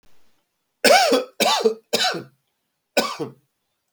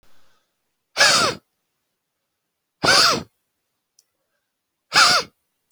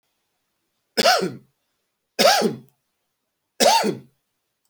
{"cough_length": "3.9 s", "cough_amplitude": 28842, "cough_signal_mean_std_ratio": 0.44, "exhalation_length": "5.7 s", "exhalation_amplitude": 27696, "exhalation_signal_mean_std_ratio": 0.34, "three_cough_length": "4.7 s", "three_cough_amplitude": 27195, "three_cough_signal_mean_std_ratio": 0.37, "survey_phase": "alpha (2021-03-01 to 2021-08-12)", "age": "45-64", "gender": "Male", "wearing_mask": "No", "symptom_cough_any": true, "symptom_fatigue": true, "symptom_change_to_sense_of_smell_or_taste": true, "symptom_loss_of_taste": true, "symptom_onset": "5 days", "smoker_status": "Current smoker (1 to 10 cigarettes per day)", "respiratory_condition_asthma": false, "respiratory_condition_other": false, "recruitment_source": "Test and Trace", "submission_delay": "2 days", "covid_test_result": "Positive", "covid_test_method": "RT-qPCR", "covid_ct_value": 19.7, "covid_ct_gene": "ORF1ab gene", "covid_ct_mean": 20.3, "covid_viral_load": "220000 copies/ml", "covid_viral_load_category": "Low viral load (10K-1M copies/ml)"}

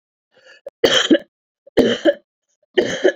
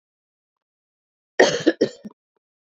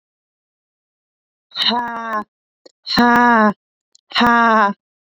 {"three_cough_length": "3.2 s", "three_cough_amplitude": 28931, "three_cough_signal_mean_std_ratio": 0.42, "cough_length": "2.6 s", "cough_amplitude": 27326, "cough_signal_mean_std_ratio": 0.26, "exhalation_length": "5.0 s", "exhalation_amplitude": 28277, "exhalation_signal_mean_std_ratio": 0.46, "survey_phase": "beta (2021-08-13 to 2022-03-07)", "age": "18-44", "gender": "Female", "wearing_mask": "No", "symptom_cough_any": true, "symptom_runny_or_blocked_nose": true, "symptom_abdominal_pain": true, "symptom_diarrhoea": true, "symptom_fatigue": true, "symptom_headache": true, "symptom_change_to_sense_of_smell_or_taste": true, "symptom_loss_of_taste": true, "symptom_onset": "4 days", "smoker_status": "Never smoked", "respiratory_condition_asthma": false, "respiratory_condition_other": false, "recruitment_source": "Test and Trace", "submission_delay": "3 days", "covid_test_result": "Positive", "covid_test_method": "RT-qPCR", "covid_ct_value": 26.8, "covid_ct_gene": "N gene"}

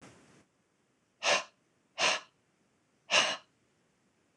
{"exhalation_length": "4.4 s", "exhalation_amplitude": 10441, "exhalation_signal_mean_std_ratio": 0.31, "survey_phase": "beta (2021-08-13 to 2022-03-07)", "age": "45-64", "gender": "Female", "wearing_mask": "No", "symptom_headache": true, "symptom_other": true, "smoker_status": "Never smoked", "respiratory_condition_asthma": false, "respiratory_condition_other": false, "recruitment_source": "REACT", "submission_delay": "1 day", "covid_test_result": "Negative", "covid_test_method": "RT-qPCR", "influenza_a_test_result": "Negative", "influenza_b_test_result": "Negative"}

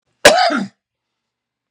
{"cough_length": "1.7 s", "cough_amplitude": 32768, "cough_signal_mean_std_ratio": 0.36, "survey_phase": "beta (2021-08-13 to 2022-03-07)", "age": "45-64", "gender": "Male", "wearing_mask": "No", "symptom_none": true, "smoker_status": "Ex-smoker", "respiratory_condition_asthma": true, "respiratory_condition_other": false, "recruitment_source": "REACT", "submission_delay": "1 day", "covid_test_result": "Negative", "covid_test_method": "RT-qPCR", "influenza_a_test_result": "Negative", "influenza_b_test_result": "Negative"}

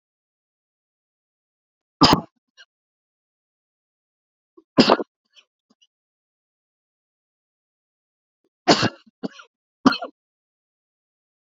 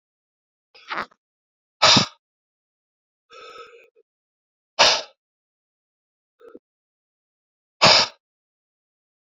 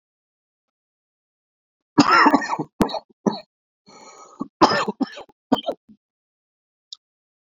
{"three_cough_length": "11.5 s", "three_cough_amplitude": 32767, "three_cough_signal_mean_std_ratio": 0.18, "exhalation_length": "9.3 s", "exhalation_amplitude": 32767, "exhalation_signal_mean_std_ratio": 0.22, "cough_length": "7.4 s", "cough_amplitude": 28620, "cough_signal_mean_std_ratio": 0.3, "survey_phase": "beta (2021-08-13 to 2022-03-07)", "age": "45-64", "gender": "Male", "wearing_mask": "No", "symptom_cough_any": true, "symptom_shortness_of_breath": true, "symptom_sore_throat": true, "symptom_abdominal_pain": true, "symptom_diarrhoea": true, "symptom_fatigue": true, "symptom_fever_high_temperature": true, "symptom_onset": "3 days", "smoker_status": "Ex-smoker", "respiratory_condition_asthma": false, "respiratory_condition_other": false, "recruitment_source": "Test and Trace", "submission_delay": "2 days", "covid_test_result": "Positive", "covid_test_method": "RT-qPCR", "covid_ct_value": 28.0, "covid_ct_gene": "N gene"}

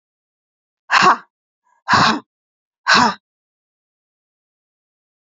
{"exhalation_length": "5.2 s", "exhalation_amplitude": 32768, "exhalation_signal_mean_std_ratio": 0.31, "survey_phase": "alpha (2021-03-01 to 2021-08-12)", "age": "45-64", "gender": "Female", "wearing_mask": "No", "symptom_none": true, "smoker_status": "Never smoked", "respiratory_condition_asthma": true, "respiratory_condition_other": false, "recruitment_source": "REACT", "submission_delay": "3 days", "covid_test_result": "Negative", "covid_test_method": "RT-qPCR", "covid_ct_value": 46.0, "covid_ct_gene": "N gene"}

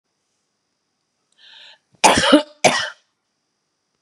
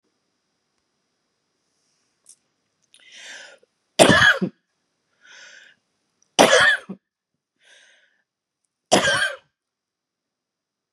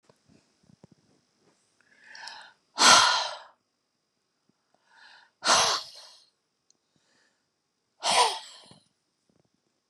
{"cough_length": "4.0 s", "cough_amplitude": 32767, "cough_signal_mean_std_ratio": 0.29, "three_cough_length": "10.9 s", "three_cough_amplitude": 32768, "three_cough_signal_mean_std_ratio": 0.26, "exhalation_length": "9.9 s", "exhalation_amplitude": 27081, "exhalation_signal_mean_std_ratio": 0.27, "survey_phase": "beta (2021-08-13 to 2022-03-07)", "age": "45-64", "gender": "Female", "wearing_mask": "No", "symptom_runny_or_blocked_nose": true, "symptom_fatigue": true, "symptom_headache": true, "symptom_onset": "12 days", "smoker_status": "Ex-smoker", "respiratory_condition_asthma": false, "respiratory_condition_other": false, "recruitment_source": "REACT", "submission_delay": "3 days", "covid_test_result": "Negative", "covid_test_method": "RT-qPCR", "influenza_a_test_result": "Negative", "influenza_b_test_result": "Negative"}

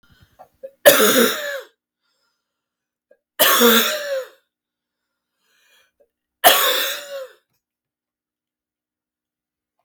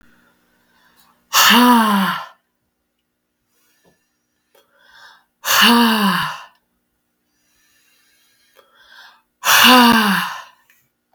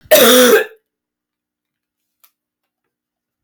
{"three_cough_length": "9.8 s", "three_cough_amplitude": 32768, "three_cough_signal_mean_std_ratio": 0.34, "exhalation_length": "11.1 s", "exhalation_amplitude": 32768, "exhalation_signal_mean_std_ratio": 0.4, "cough_length": "3.4 s", "cough_amplitude": 32768, "cough_signal_mean_std_ratio": 0.35, "survey_phase": "beta (2021-08-13 to 2022-03-07)", "age": "18-44", "gender": "Female", "wearing_mask": "No", "symptom_runny_or_blocked_nose": true, "symptom_headache": true, "symptom_loss_of_taste": true, "symptom_onset": "6 days", "smoker_status": "Ex-smoker", "respiratory_condition_asthma": false, "respiratory_condition_other": false, "recruitment_source": "Test and Trace", "submission_delay": "2 days", "covid_test_result": "Positive", "covid_test_method": "RT-qPCR", "covid_ct_value": 20.5, "covid_ct_gene": "ORF1ab gene"}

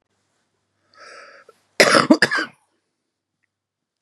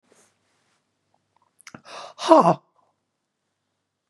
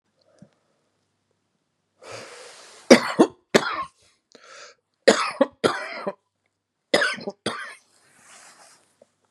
{"cough_length": "4.0 s", "cough_amplitude": 32768, "cough_signal_mean_std_ratio": 0.27, "exhalation_length": "4.1 s", "exhalation_amplitude": 31986, "exhalation_signal_mean_std_ratio": 0.2, "three_cough_length": "9.3 s", "three_cough_amplitude": 32768, "three_cough_signal_mean_std_ratio": 0.26, "survey_phase": "beta (2021-08-13 to 2022-03-07)", "age": "65+", "gender": "Female", "wearing_mask": "No", "symptom_none": true, "symptom_onset": "12 days", "smoker_status": "Ex-smoker", "respiratory_condition_asthma": false, "respiratory_condition_other": false, "recruitment_source": "REACT", "submission_delay": "1 day", "covid_test_result": "Positive", "covid_test_method": "RT-qPCR", "covid_ct_value": 38.5, "covid_ct_gene": "N gene", "influenza_a_test_result": "Negative", "influenza_b_test_result": "Negative"}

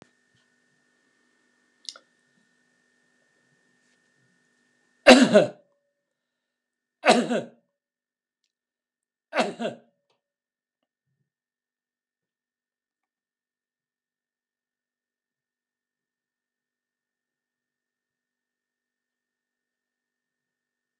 {"three_cough_length": "21.0 s", "three_cough_amplitude": 32767, "three_cough_signal_mean_std_ratio": 0.14, "survey_phase": "alpha (2021-03-01 to 2021-08-12)", "age": "65+", "gender": "Male", "wearing_mask": "No", "symptom_none": true, "smoker_status": "Never smoked", "respiratory_condition_asthma": false, "respiratory_condition_other": false, "recruitment_source": "REACT", "submission_delay": "5 days", "covid_test_result": "Negative", "covid_test_method": "RT-qPCR"}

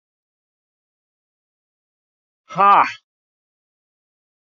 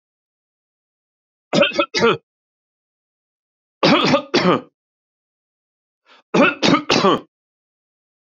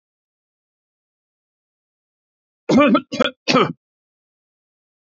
{"exhalation_length": "4.5 s", "exhalation_amplitude": 27404, "exhalation_signal_mean_std_ratio": 0.2, "three_cough_length": "8.4 s", "three_cough_amplitude": 32514, "three_cough_signal_mean_std_ratio": 0.36, "cough_length": "5.0 s", "cough_amplitude": 27288, "cough_signal_mean_std_ratio": 0.28, "survey_phase": "beta (2021-08-13 to 2022-03-07)", "age": "65+", "gender": "Male", "wearing_mask": "No", "symptom_none": true, "smoker_status": "Never smoked", "respiratory_condition_asthma": false, "respiratory_condition_other": false, "recruitment_source": "REACT", "submission_delay": "17 days", "covid_test_result": "Negative", "covid_test_method": "RT-qPCR", "influenza_a_test_result": "Negative", "influenza_b_test_result": "Negative"}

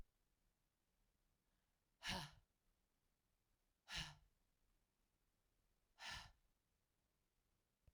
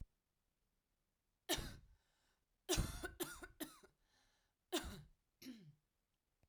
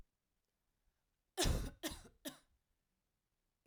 {"exhalation_length": "7.9 s", "exhalation_amplitude": 663, "exhalation_signal_mean_std_ratio": 0.27, "three_cough_length": "6.5 s", "three_cough_amplitude": 1769, "three_cough_signal_mean_std_ratio": 0.33, "cough_length": "3.7 s", "cough_amplitude": 2560, "cough_signal_mean_std_ratio": 0.29, "survey_phase": "beta (2021-08-13 to 2022-03-07)", "age": "18-44", "gender": "Female", "wearing_mask": "No", "symptom_cough_any": true, "symptom_new_continuous_cough": true, "symptom_runny_or_blocked_nose": true, "smoker_status": "Never smoked", "respiratory_condition_asthma": false, "respiratory_condition_other": false, "recruitment_source": "Test and Trace", "submission_delay": "1 day", "covid_test_result": "Positive", "covid_test_method": "RT-qPCR", "covid_ct_value": 19.2, "covid_ct_gene": "N gene"}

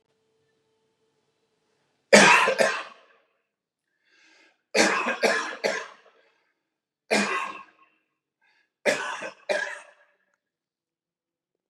{"cough_length": "11.7 s", "cough_amplitude": 30902, "cough_signal_mean_std_ratio": 0.32, "survey_phase": "beta (2021-08-13 to 2022-03-07)", "age": "45-64", "gender": "Male", "wearing_mask": "No", "symptom_none": true, "smoker_status": "Never smoked", "respiratory_condition_asthma": false, "respiratory_condition_other": false, "recruitment_source": "REACT", "submission_delay": "32 days", "covid_test_result": "Negative", "covid_test_method": "RT-qPCR", "influenza_a_test_result": "Unknown/Void", "influenza_b_test_result": "Unknown/Void"}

